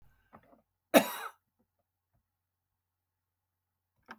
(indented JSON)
{
  "cough_length": "4.2 s",
  "cough_amplitude": 15097,
  "cough_signal_mean_std_ratio": 0.14,
  "survey_phase": "beta (2021-08-13 to 2022-03-07)",
  "age": "65+",
  "gender": "Female",
  "wearing_mask": "No",
  "symptom_none": true,
  "smoker_status": "Never smoked",
  "respiratory_condition_asthma": false,
  "respiratory_condition_other": false,
  "recruitment_source": "REACT",
  "submission_delay": "2 days",
  "covid_test_result": "Negative",
  "covid_test_method": "RT-qPCR",
  "influenza_a_test_result": "Negative",
  "influenza_b_test_result": "Negative"
}